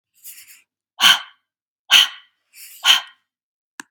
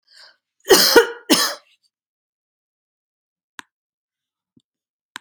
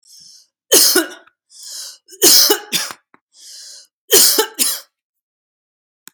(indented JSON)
{
  "exhalation_length": "3.9 s",
  "exhalation_amplitude": 32768,
  "exhalation_signal_mean_std_ratio": 0.29,
  "cough_length": "5.2 s",
  "cough_amplitude": 32768,
  "cough_signal_mean_std_ratio": 0.25,
  "three_cough_length": "6.1 s",
  "three_cough_amplitude": 32768,
  "three_cough_signal_mean_std_ratio": 0.39,
  "survey_phase": "beta (2021-08-13 to 2022-03-07)",
  "age": "45-64",
  "gender": "Female",
  "wearing_mask": "No",
  "symptom_none": true,
  "symptom_onset": "4 days",
  "smoker_status": "Ex-smoker",
  "respiratory_condition_asthma": false,
  "respiratory_condition_other": false,
  "recruitment_source": "REACT",
  "submission_delay": "0 days",
  "covid_test_result": "Negative",
  "covid_test_method": "RT-qPCR",
  "influenza_a_test_result": "Negative",
  "influenza_b_test_result": "Negative"
}